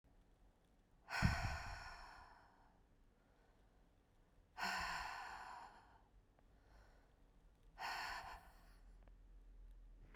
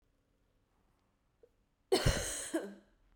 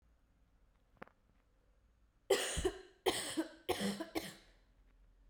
{"exhalation_length": "10.2 s", "exhalation_amplitude": 2536, "exhalation_signal_mean_std_ratio": 0.46, "cough_length": "3.2 s", "cough_amplitude": 4580, "cough_signal_mean_std_ratio": 0.34, "three_cough_length": "5.3 s", "three_cough_amplitude": 4503, "three_cough_signal_mean_std_ratio": 0.4, "survey_phase": "beta (2021-08-13 to 2022-03-07)", "age": "18-44", "gender": "Female", "wearing_mask": "No", "symptom_cough_any": true, "symptom_runny_or_blocked_nose": true, "symptom_sore_throat": true, "symptom_headache": true, "symptom_other": true, "symptom_onset": "4 days", "smoker_status": "Never smoked", "respiratory_condition_asthma": false, "respiratory_condition_other": false, "recruitment_source": "Test and Trace", "submission_delay": "1 day", "covid_test_result": "Positive", "covid_test_method": "RT-qPCR", "covid_ct_value": 15.5, "covid_ct_gene": "ORF1ab gene"}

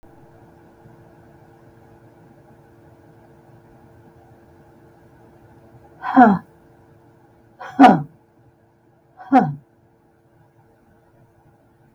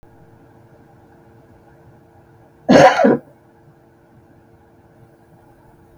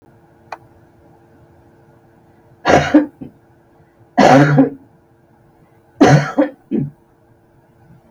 {"exhalation_length": "11.9 s", "exhalation_amplitude": 32768, "exhalation_signal_mean_std_ratio": 0.21, "cough_length": "6.0 s", "cough_amplitude": 32768, "cough_signal_mean_std_ratio": 0.25, "three_cough_length": "8.1 s", "three_cough_amplitude": 32768, "three_cough_signal_mean_std_ratio": 0.35, "survey_phase": "beta (2021-08-13 to 2022-03-07)", "age": "65+", "gender": "Female", "wearing_mask": "No", "symptom_none": true, "smoker_status": "Never smoked", "respiratory_condition_asthma": false, "respiratory_condition_other": false, "recruitment_source": "REACT", "submission_delay": "2 days", "covid_test_result": "Negative", "covid_test_method": "RT-qPCR", "influenza_a_test_result": "Negative", "influenza_b_test_result": "Negative"}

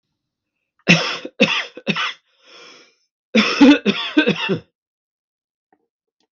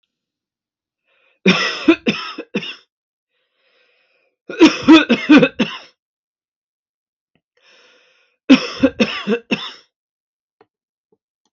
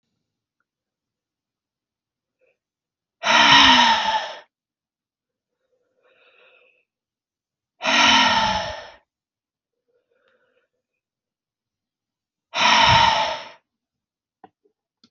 {"cough_length": "6.3 s", "cough_amplitude": 32766, "cough_signal_mean_std_ratio": 0.38, "three_cough_length": "11.5 s", "three_cough_amplitude": 32768, "three_cough_signal_mean_std_ratio": 0.3, "exhalation_length": "15.1 s", "exhalation_amplitude": 31532, "exhalation_signal_mean_std_ratio": 0.33, "survey_phase": "beta (2021-08-13 to 2022-03-07)", "age": "45-64", "gender": "Male", "wearing_mask": "No", "symptom_none": true, "smoker_status": "Never smoked", "respiratory_condition_asthma": false, "respiratory_condition_other": false, "recruitment_source": "REACT", "submission_delay": "2 days", "covid_test_result": "Negative", "covid_test_method": "RT-qPCR"}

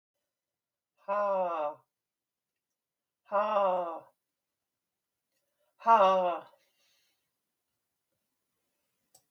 {"exhalation_length": "9.3 s", "exhalation_amplitude": 9318, "exhalation_signal_mean_std_ratio": 0.34, "survey_phase": "beta (2021-08-13 to 2022-03-07)", "age": "65+", "gender": "Female", "wearing_mask": "No", "symptom_cough_any": true, "smoker_status": "Never smoked", "respiratory_condition_asthma": false, "respiratory_condition_other": false, "recruitment_source": "REACT", "submission_delay": "3 days", "covid_test_result": "Negative", "covid_test_method": "RT-qPCR", "influenza_a_test_result": "Negative", "influenza_b_test_result": "Negative"}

